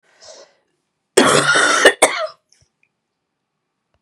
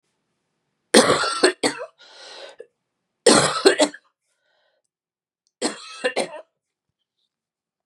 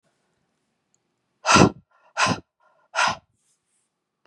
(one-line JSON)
{"cough_length": "4.0 s", "cough_amplitude": 32768, "cough_signal_mean_std_ratio": 0.39, "three_cough_length": "7.9 s", "three_cough_amplitude": 32767, "three_cough_signal_mean_std_ratio": 0.32, "exhalation_length": "4.3 s", "exhalation_amplitude": 31293, "exhalation_signal_mean_std_ratio": 0.28, "survey_phase": "beta (2021-08-13 to 2022-03-07)", "age": "45-64", "gender": "Female", "wearing_mask": "No", "symptom_none": true, "symptom_onset": "5 days", "smoker_status": "Never smoked", "respiratory_condition_asthma": false, "respiratory_condition_other": false, "recruitment_source": "Test and Trace", "submission_delay": "3 days", "covid_test_result": "Negative", "covid_test_method": "RT-qPCR"}